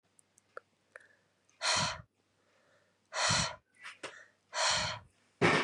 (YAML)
exhalation_length: 5.6 s
exhalation_amplitude: 7132
exhalation_signal_mean_std_ratio: 0.42
survey_phase: beta (2021-08-13 to 2022-03-07)
age: 18-44
gender: Female
wearing_mask: 'No'
symptom_none: true
smoker_status: Ex-smoker
respiratory_condition_asthma: false
respiratory_condition_other: false
recruitment_source: REACT
submission_delay: 1 day
covid_test_result: Negative
covid_test_method: RT-qPCR
influenza_a_test_result: Unknown/Void
influenza_b_test_result: Unknown/Void